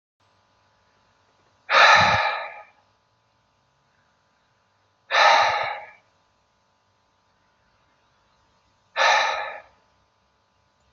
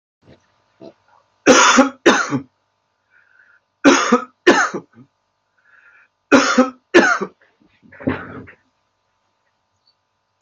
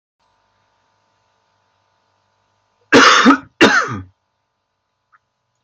{
  "exhalation_length": "10.9 s",
  "exhalation_amplitude": 26674,
  "exhalation_signal_mean_std_ratio": 0.32,
  "three_cough_length": "10.4 s",
  "three_cough_amplitude": 30069,
  "three_cough_signal_mean_std_ratio": 0.35,
  "cough_length": "5.6 s",
  "cough_amplitude": 32767,
  "cough_signal_mean_std_ratio": 0.3,
  "survey_phase": "beta (2021-08-13 to 2022-03-07)",
  "age": "65+",
  "gender": "Male",
  "wearing_mask": "No",
  "symptom_none": true,
  "smoker_status": "Never smoked",
  "respiratory_condition_asthma": false,
  "respiratory_condition_other": false,
  "recruitment_source": "REACT",
  "submission_delay": "2 days",
  "covid_test_result": "Negative",
  "covid_test_method": "RT-qPCR"
}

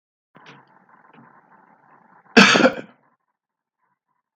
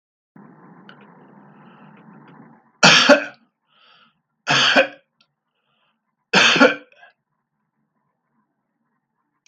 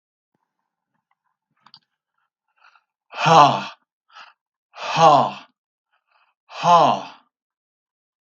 {
  "cough_length": "4.4 s",
  "cough_amplitude": 32768,
  "cough_signal_mean_std_ratio": 0.23,
  "three_cough_length": "9.5 s",
  "three_cough_amplitude": 32768,
  "three_cough_signal_mean_std_ratio": 0.28,
  "exhalation_length": "8.3 s",
  "exhalation_amplitude": 32768,
  "exhalation_signal_mean_std_ratio": 0.3,
  "survey_phase": "beta (2021-08-13 to 2022-03-07)",
  "age": "65+",
  "gender": "Male",
  "wearing_mask": "No",
  "symptom_none": true,
  "smoker_status": "Never smoked",
  "respiratory_condition_asthma": false,
  "respiratory_condition_other": false,
  "recruitment_source": "REACT",
  "submission_delay": "3 days",
  "covid_test_result": "Negative",
  "covid_test_method": "RT-qPCR",
  "influenza_a_test_result": "Negative",
  "influenza_b_test_result": "Negative"
}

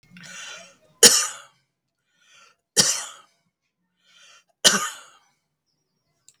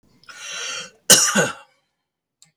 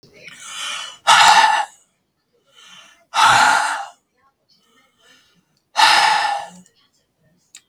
{
  "three_cough_length": "6.4 s",
  "three_cough_amplitude": 32768,
  "three_cough_signal_mean_std_ratio": 0.24,
  "cough_length": "2.6 s",
  "cough_amplitude": 32768,
  "cough_signal_mean_std_ratio": 0.35,
  "exhalation_length": "7.7 s",
  "exhalation_amplitude": 32768,
  "exhalation_signal_mean_std_ratio": 0.43,
  "survey_phase": "beta (2021-08-13 to 2022-03-07)",
  "age": "65+",
  "gender": "Male",
  "wearing_mask": "No",
  "symptom_none": true,
  "smoker_status": "Ex-smoker",
  "respiratory_condition_asthma": false,
  "respiratory_condition_other": false,
  "recruitment_source": "REACT",
  "submission_delay": "3 days",
  "covid_test_result": "Negative",
  "covid_test_method": "RT-qPCR",
  "influenza_a_test_result": "Negative",
  "influenza_b_test_result": "Negative"
}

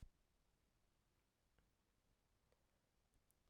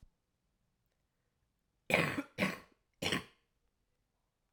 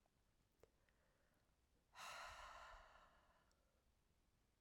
{
  "cough_length": "3.5 s",
  "cough_amplitude": 167,
  "cough_signal_mean_std_ratio": 0.4,
  "three_cough_length": "4.5 s",
  "three_cough_amplitude": 7939,
  "three_cough_signal_mean_std_ratio": 0.29,
  "exhalation_length": "4.6 s",
  "exhalation_amplitude": 200,
  "exhalation_signal_mean_std_ratio": 0.5,
  "survey_phase": "beta (2021-08-13 to 2022-03-07)",
  "age": "18-44",
  "gender": "Female",
  "wearing_mask": "No",
  "symptom_cough_any": true,
  "symptom_new_continuous_cough": true,
  "symptom_runny_or_blocked_nose": true,
  "symptom_sore_throat": true,
  "symptom_diarrhoea": true,
  "symptom_fatigue": true,
  "symptom_fever_high_temperature": true,
  "symptom_headache": true,
  "symptom_onset": "3 days",
  "smoker_status": "Never smoked",
  "respiratory_condition_asthma": true,
  "respiratory_condition_other": false,
  "recruitment_source": "Test and Trace",
  "submission_delay": "2 days",
  "covid_test_result": "Positive",
  "covid_test_method": "RT-qPCR"
}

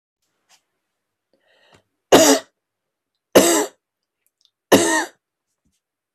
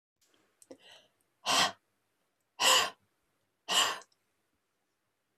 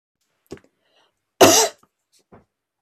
{
  "three_cough_length": "6.1 s",
  "three_cough_amplitude": 32767,
  "three_cough_signal_mean_std_ratio": 0.29,
  "exhalation_length": "5.4 s",
  "exhalation_amplitude": 8833,
  "exhalation_signal_mean_std_ratio": 0.31,
  "cough_length": "2.8 s",
  "cough_amplitude": 32767,
  "cough_signal_mean_std_ratio": 0.25,
  "survey_phase": "beta (2021-08-13 to 2022-03-07)",
  "age": "45-64",
  "gender": "Female",
  "wearing_mask": "No",
  "symptom_none": true,
  "smoker_status": "Never smoked",
  "respiratory_condition_asthma": false,
  "respiratory_condition_other": false,
  "recruitment_source": "REACT",
  "submission_delay": "1 day",
  "covid_test_result": "Negative",
  "covid_test_method": "RT-qPCR"
}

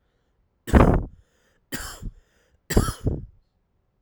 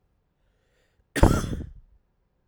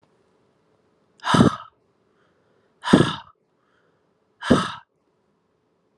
{
  "three_cough_length": "4.0 s",
  "three_cough_amplitude": 32767,
  "three_cough_signal_mean_std_ratio": 0.32,
  "cough_length": "2.5 s",
  "cough_amplitude": 28875,
  "cough_signal_mean_std_ratio": 0.27,
  "exhalation_length": "6.0 s",
  "exhalation_amplitude": 32768,
  "exhalation_signal_mean_std_ratio": 0.26,
  "survey_phase": "alpha (2021-03-01 to 2021-08-12)",
  "age": "18-44",
  "gender": "Male",
  "wearing_mask": "No",
  "symptom_cough_any": true,
  "symptom_new_continuous_cough": true,
  "symptom_abdominal_pain": true,
  "symptom_fatigue": true,
  "symptom_fever_high_temperature": true,
  "symptom_headache": true,
  "symptom_onset": "2 days",
  "smoker_status": "Never smoked",
  "respiratory_condition_asthma": false,
  "respiratory_condition_other": false,
  "recruitment_source": "Test and Trace",
  "submission_delay": "2 days",
  "covid_test_result": "Positive",
  "covid_test_method": "RT-qPCR"
}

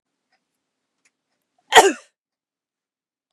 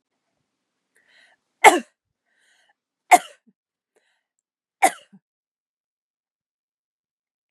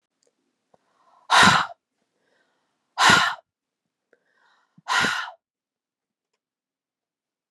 {
  "cough_length": "3.3 s",
  "cough_amplitude": 32768,
  "cough_signal_mean_std_ratio": 0.17,
  "three_cough_length": "7.5 s",
  "three_cough_amplitude": 32768,
  "three_cough_signal_mean_std_ratio": 0.14,
  "exhalation_length": "7.5 s",
  "exhalation_amplitude": 25529,
  "exhalation_signal_mean_std_ratio": 0.28,
  "survey_phase": "beta (2021-08-13 to 2022-03-07)",
  "age": "45-64",
  "gender": "Female",
  "wearing_mask": "No",
  "symptom_cough_any": true,
  "symptom_runny_or_blocked_nose": true,
  "symptom_fatigue": true,
  "smoker_status": "Never smoked",
  "respiratory_condition_asthma": false,
  "respiratory_condition_other": false,
  "recruitment_source": "REACT",
  "submission_delay": "2 days",
  "covid_test_result": "Negative",
  "covid_test_method": "RT-qPCR",
  "influenza_a_test_result": "Negative",
  "influenza_b_test_result": "Negative"
}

